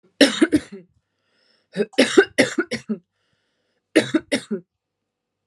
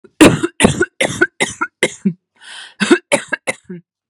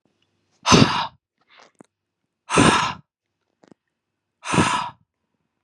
{"three_cough_length": "5.5 s", "three_cough_amplitude": 32570, "three_cough_signal_mean_std_ratio": 0.34, "cough_length": "4.1 s", "cough_amplitude": 32768, "cough_signal_mean_std_ratio": 0.42, "exhalation_length": "5.6 s", "exhalation_amplitude": 32257, "exhalation_signal_mean_std_ratio": 0.34, "survey_phase": "beta (2021-08-13 to 2022-03-07)", "age": "18-44", "gender": "Female", "wearing_mask": "No", "symptom_none": true, "symptom_onset": "9 days", "smoker_status": "Never smoked", "respiratory_condition_asthma": false, "respiratory_condition_other": false, "recruitment_source": "REACT", "submission_delay": "3 days", "covid_test_result": "Negative", "covid_test_method": "RT-qPCR", "influenza_a_test_result": "Negative", "influenza_b_test_result": "Negative"}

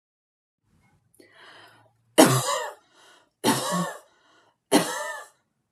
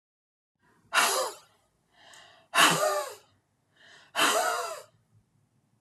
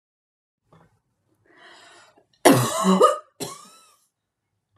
{"three_cough_length": "5.7 s", "three_cough_amplitude": 31455, "three_cough_signal_mean_std_ratio": 0.33, "exhalation_length": "5.8 s", "exhalation_amplitude": 14426, "exhalation_signal_mean_std_ratio": 0.41, "cough_length": "4.8 s", "cough_amplitude": 32752, "cough_signal_mean_std_ratio": 0.3, "survey_phase": "beta (2021-08-13 to 2022-03-07)", "age": "18-44", "gender": "Female", "wearing_mask": "No", "symptom_none": true, "smoker_status": "Never smoked", "respiratory_condition_asthma": false, "respiratory_condition_other": false, "recruitment_source": "REACT", "submission_delay": "1 day", "covid_test_result": "Negative", "covid_test_method": "RT-qPCR", "influenza_a_test_result": "Negative", "influenza_b_test_result": "Negative"}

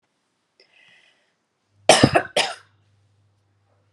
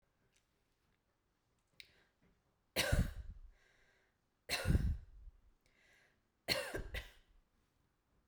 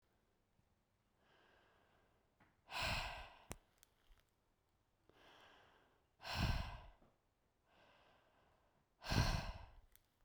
{"cough_length": "3.9 s", "cough_amplitude": 32768, "cough_signal_mean_std_ratio": 0.23, "three_cough_length": "8.3 s", "three_cough_amplitude": 3221, "three_cough_signal_mean_std_ratio": 0.32, "exhalation_length": "10.2 s", "exhalation_amplitude": 2431, "exhalation_signal_mean_std_ratio": 0.32, "survey_phase": "beta (2021-08-13 to 2022-03-07)", "age": "18-44", "gender": "Female", "wearing_mask": "No", "symptom_runny_or_blocked_nose": true, "symptom_fatigue": true, "symptom_change_to_sense_of_smell_or_taste": true, "symptom_onset": "5 days", "smoker_status": "Never smoked", "respiratory_condition_asthma": false, "respiratory_condition_other": false, "recruitment_source": "Test and Trace", "submission_delay": "2 days", "covid_test_result": "Positive", "covid_test_method": "ePCR"}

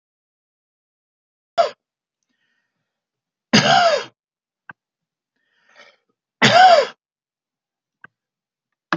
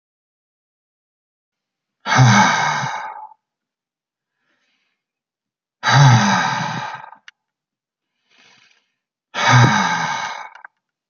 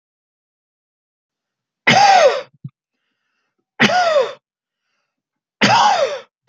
{"cough_length": "9.0 s", "cough_amplitude": 30561, "cough_signal_mean_std_ratio": 0.27, "exhalation_length": "11.1 s", "exhalation_amplitude": 30670, "exhalation_signal_mean_std_ratio": 0.4, "three_cough_length": "6.5 s", "three_cough_amplitude": 31614, "three_cough_signal_mean_std_ratio": 0.41, "survey_phase": "beta (2021-08-13 to 2022-03-07)", "age": "45-64", "gender": "Male", "wearing_mask": "No", "symptom_none": true, "smoker_status": "Ex-smoker", "respiratory_condition_asthma": false, "respiratory_condition_other": false, "recruitment_source": "Test and Trace", "submission_delay": "3 days", "covid_test_result": "Negative", "covid_test_method": "RT-qPCR"}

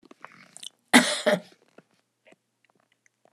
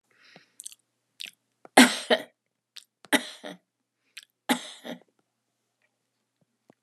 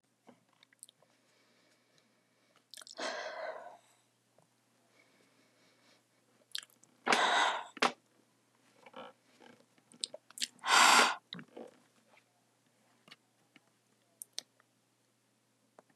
{"cough_length": "3.3 s", "cough_amplitude": 30854, "cough_signal_mean_std_ratio": 0.24, "three_cough_length": "6.8 s", "three_cough_amplitude": 30220, "three_cough_signal_mean_std_ratio": 0.19, "exhalation_length": "16.0 s", "exhalation_amplitude": 8752, "exhalation_signal_mean_std_ratio": 0.25, "survey_phase": "alpha (2021-03-01 to 2021-08-12)", "age": "65+", "gender": "Female", "wearing_mask": "No", "symptom_none": true, "smoker_status": "Never smoked", "respiratory_condition_asthma": false, "respiratory_condition_other": false, "recruitment_source": "REACT", "submission_delay": "2 days", "covid_test_result": "Negative", "covid_test_method": "RT-qPCR"}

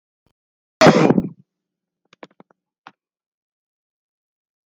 {"cough_length": "4.7 s", "cough_amplitude": 31246, "cough_signal_mean_std_ratio": 0.22, "survey_phase": "alpha (2021-03-01 to 2021-08-12)", "age": "45-64", "gender": "Male", "wearing_mask": "No", "symptom_none": true, "smoker_status": "Never smoked", "respiratory_condition_asthma": true, "respiratory_condition_other": false, "recruitment_source": "REACT", "submission_delay": "5 days", "covid_test_result": "Negative", "covid_test_method": "RT-qPCR"}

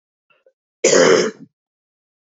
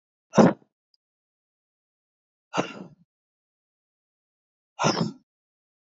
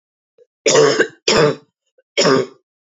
{"cough_length": "2.4 s", "cough_amplitude": 32177, "cough_signal_mean_std_ratio": 0.36, "exhalation_length": "5.8 s", "exhalation_amplitude": 23722, "exhalation_signal_mean_std_ratio": 0.22, "three_cough_length": "2.8 s", "three_cough_amplitude": 29122, "three_cough_signal_mean_std_ratio": 0.5, "survey_phase": "beta (2021-08-13 to 2022-03-07)", "age": "18-44", "gender": "Female", "wearing_mask": "No", "symptom_cough_any": true, "symptom_runny_or_blocked_nose": true, "symptom_sore_throat": true, "symptom_fatigue": true, "symptom_onset": "5 days", "smoker_status": "Never smoked", "respiratory_condition_asthma": false, "respiratory_condition_other": false, "recruitment_source": "Test and Trace", "submission_delay": "3 days", "covid_test_result": "Negative", "covid_test_method": "RT-qPCR"}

